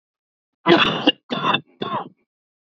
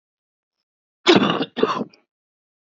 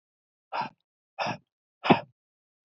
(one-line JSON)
{"three_cough_length": "2.6 s", "three_cough_amplitude": 29457, "three_cough_signal_mean_std_ratio": 0.42, "cough_length": "2.7 s", "cough_amplitude": 28591, "cough_signal_mean_std_ratio": 0.34, "exhalation_length": "2.6 s", "exhalation_amplitude": 21867, "exhalation_signal_mean_std_ratio": 0.25, "survey_phase": "beta (2021-08-13 to 2022-03-07)", "age": "45-64", "gender": "Male", "wearing_mask": "No", "symptom_cough_any": true, "symptom_runny_or_blocked_nose": true, "symptom_shortness_of_breath": true, "symptom_sore_throat": true, "symptom_fatigue": true, "symptom_fever_high_temperature": true, "symptom_headache": true, "smoker_status": "Never smoked", "respiratory_condition_asthma": false, "respiratory_condition_other": false, "recruitment_source": "Test and Trace", "submission_delay": "1 day", "covid_test_result": "Positive", "covid_test_method": "LFT"}